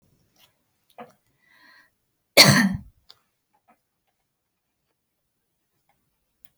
cough_length: 6.6 s
cough_amplitude: 32367
cough_signal_mean_std_ratio: 0.18
survey_phase: alpha (2021-03-01 to 2021-08-12)
age: 45-64
gender: Female
wearing_mask: 'No'
symptom_none: true
smoker_status: Ex-smoker
respiratory_condition_asthma: false
respiratory_condition_other: false
recruitment_source: REACT
submission_delay: 3 days
covid_test_result: Negative
covid_test_method: RT-qPCR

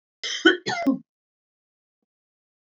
cough_length: 2.6 s
cough_amplitude: 24400
cough_signal_mean_std_ratio: 0.31
survey_phase: beta (2021-08-13 to 2022-03-07)
age: 65+
gender: Female
wearing_mask: 'No'
symptom_none: true
smoker_status: Never smoked
respiratory_condition_asthma: false
respiratory_condition_other: false
recruitment_source: REACT
submission_delay: 2 days
covid_test_result: Negative
covid_test_method: RT-qPCR
influenza_a_test_result: Negative
influenza_b_test_result: Negative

